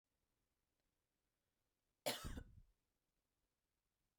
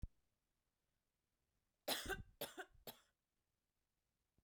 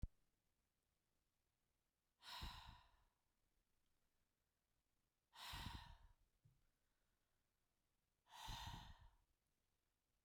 {"cough_length": "4.2 s", "cough_amplitude": 1134, "cough_signal_mean_std_ratio": 0.23, "three_cough_length": "4.4 s", "three_cough_amplitude": 1471, "three_cough_signal_mean_std_ratio": 0.28, "exhalation_length": "10.2 s", "exhalation_amplitude": 575, "exhalation_signal_mean_std_ratio": 0.36, "survey_phase": "beta (2021-08-13 to 2022-03-07)", "age": "18-44", "gender": "Female", "wearing_mask": "No", "symptom_none": true, "smoker_status": "Never smoked", "respiratory_condition_asthma": false, "respiratory_condition_other": false, "recruitment_source": "REACT", "submission_delay": "1 day", "covid_test_result": "Negative", "covid_test_method": "RT-qPCR", "influenza_a_test_result": "Negative", "influenza_b_test_result": "Negative"}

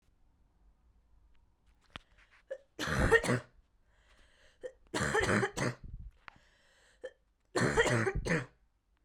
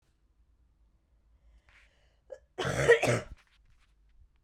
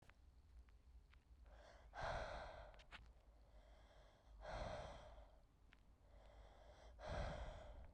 {"three_cough_length": "9.0 s", "three_cough_amplitude": 7646, "three_cough_signal_mean_std_ratio": 0.41, "cough_length": "4.4 s", "cough_amplitude": 10928, "cough_signal_mean_std_ratio": 0.27, "exhalation_length": "7.9 s", "exhalation_amplitude": 548, "exhalation_signal_mean_std_ratio": 0.67, "survey_phase": "beta (2021-08-13 to 2022-03-07)", "age": "18-44", "gender": "Female", "wearing_mask": "No", "symptom_cough_any": true, "symptom_runny_or_blocked_nose": true, "symptom_shortness_of_breath": true, "symptom_sore_throat": true, "symptom_abdominal_pain": true, "symptom_diarrhoea": true, "symptom_fatigue": true, "symptom_fever_high_temperature": true, "symptom_headache": true, "smoker_status": "Never smoked", "respiratory_condition_asthma": false, "respiratory_condition_other": false, "recruitment_source": "Test and Trace", "submission_delay": "2 days", "covid_test_result": "Positive", "covid_test_method": "LFT"}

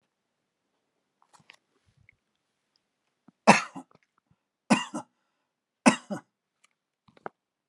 {"three_cough_length": "7.7 s", "three_cough_amplitude": 28802, "three_cough_signal_mean_std_ratio": 0.16, "survey_phase": "alpha (2021-03-01 to 2021-08-12)", "age": "65+", "gender": "Male", "wearing_mask": "No", "symptom_none": true, "smoker_status": "Never smoked", "respiratory_condition_asthma": false, "respiratory_condition_other": false, "recruitment_source": "REACT", "submission_delay": "1 day", "covid_test_result": "Negative", "covid_test_method": "RT-qPCR"}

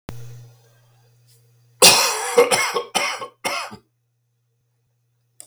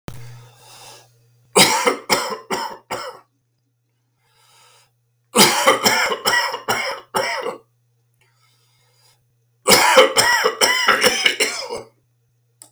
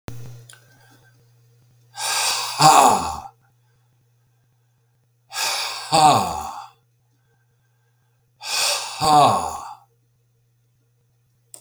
{"cough_length": "5.5 s", "cough_amplitude": 32768, "cough_signal_mean_std_ratio": 0.36, "three_cough_length": "12.7 s", "three_cough_amplitude": 32768, "three_cough_signal_mean_std_ratio": 0.46, "exhalation_length": "11.6 s", "exhalation_amplitude": 32767, "exhalation_signal_mean_std_ratio": 0.39, "survey_phase": "beta (2021-08-13 to 2022-03-07)", "age": "65+", "gender": "Male", "wearing_mask": "No", "symptom_sore_throat": true, "symptom_fatigue": true, "symptom_fever_high_temperature": true, "symptom_onset": "3 days", "smoker_status": "Never smoked", "respiratory_condition_asthma": false, "respiratory_condition_other": false, "recruitment_source": "Test and Trace", "submission_delay": "2 days", "covid_test_result": "Positive", "covid_test_method": "RT-qPCR", "covid_ct_value": 14.9, "covid_ct_gene": "ORF1ab gene", "covid_ct_mean": 15.2, "covid_viral_load": "10000000 copies/ml", "covid_viral_load_category": "High viral load (>1M copies/ml)"}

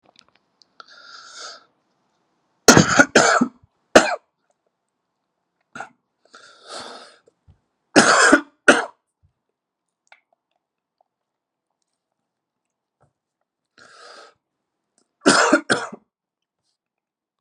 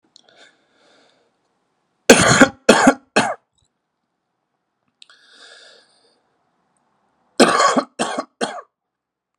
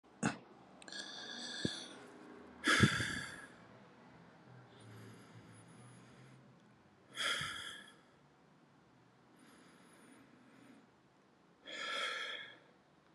{"three_cough_length": "17.4 s", "three_cough_amplitude": 32768, "three_cough_signal_mean_std_ratio": 0.25, "cough_length": "9.4 s", "cough_amplitude": 32768, "cough_signal_mean_std_ratio": 0.29, "exhalation_length": "13.1 s", "exhalation_amplitude": 6296, "exhalation_signal_mean_std_ratio": 0.39, "survey_phase": "alpha (2021-03-01 to 2021-08-12)", "age": "18-44", "gender": "Male", "wearing_mask": "No", "symptom_diarrhoea": true, "symptom_fatigue": true, "symptom_onset": "3 days", "smoker_status": "Never smoked", "respiratory_condition_asthma": false, "respiratory_condition_other": false, "recruitment_source": "Test and Trace", "submission_delay": "1 day", "covid_test_result": "Positive", "covid_test_method": "RT-qPCR", "covid_ct_value": 22.7, "covid_ct_gene": "ORF1ab gene", "covid_ct_mean": 23.3, "covid_viral_load": "23000 copies/ml", "covid_viral_load_category": "Low viral load (10K-1M copies/ml)"}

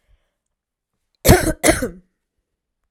{"cough_length": "2.9 s", "cough_amplitude": 32768, "cough_signal_mean_std_ratio": 0.29, "survey_phase": "alpha (2021-03-01 to 2021-08-12)", "age": "18-44", "gender": "Female", "wearing_mask": "No", "symptom_none": true, "smoker_status": "Ex-smoker", "respiratory_condition_asthma": true, "respiratory_condition_other": false, "recruitment_source": "REACT", "submission_delay": "1 day", "covid_test_result": "Negative", "covid_test_method": "RT-qPCR"}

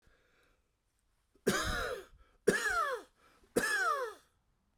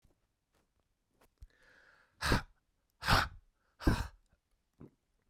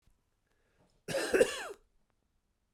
{"three_cough_length": "4.8 s", "three_cough_amplitude": 6863, "three_cough_signal_mean_std_ratio": 0.49, "exhalation_length": "5.3 s", "exhalation_amplitude": 7235, "exhalation_signal_mean_std_ratio": 0.27, "cough_length": "2.7 s", "cough_amplitude": 8492, "cough_signal_mean_std_ratio": 0.3, "survey_phase": "beta (2021-08-13 to 2022-03-07)", "age": "45-64", "gender": "Male", "wearing_mask": "No", "symptom_cough_any": true, "symptom_runny_or_blocked_nose": true, "symptom_shortness_of_breath": true, "symptom_fatigue": true, "symptom_headache": true, "symptom_change_to_sense_of_smell_or_taste": true, "symptom_onset": "5 days", "smoker_status": "Never smoked", "respiratory_condition_asthma": false, "respiratory_condition_other": false, "recruitment_source": "Test and Trace", "submission_delay": "1 day", "covid_test_result": "Positive", "covid_test_method": "RT-qPCR", "covid_ct_value": 17.6, "covid_ct_gene": "ORF1ab gene", "covid_ct_mean": 18.0, "covid_viral_load": "1200000 copies/ml", "covid_viral_load_category": "High viral load (>1M copies/ml)"}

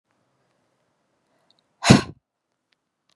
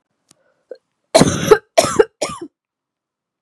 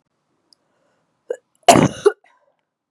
{"exhalation_length": "3.2 s", "exhalation_amplitude": 32768, "exhalation_signal_mean_std_ratio": 0.16, "three_cough_length": "3.4 s", "three_cough_amplitude": 32768, "three_cough_signal_mean_std_ratio": 0.31, "cough_length": "2.9 s", "cough_amplitude": 32768, "cough_signal_mean_std_ratio": 0.23, "survey_phase": "beta (2021-08-13 to 2022-03-07)", "age": "18-44", "gender": "Female", "wearing_mask": "No", "symptom_cough_any": true, "symptom_runny_or_blocked_nose": true, "symptom_sore_throat": true, "symptom_abdominal_pain": true, "symptom_diarrhoea": true, "symptom_fatigue": true, "symptom_headache": true, "smoker_status": "Ex-smoker", "respiratory_condition_asthma": false, "respiratory_condition_other": false, "recruitment_source": "Test and Trace", "submission_delay": "1 day", "covid_test_result": "Positive", "covid_test_method": "RT-qPCR"}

